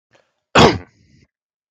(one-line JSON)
{"cough_length": "1.7 s", "cough_amplitude": 32768, "cough_signal_mean_std_ratio": 0.28, "survey_phase": "beta (2021-08-13 to 2022-03-07)", "age": "45-64", "gender": "Male", "wearing_mask": "No", "symptom_none": true, "smoker_status": "Current smoker (1 to 10 cigarettes per day)", "respiratory_condition_asthma": false, "respiratory_condition_other": false, "recruitment_source": "REACT", "submission_delay": "1 day", "covid_test_result": "Negative", "covid_test_method": "RT-qPCR", "influenza_a_test_result": "Negative", "influenza_b_test_result": "Negative"}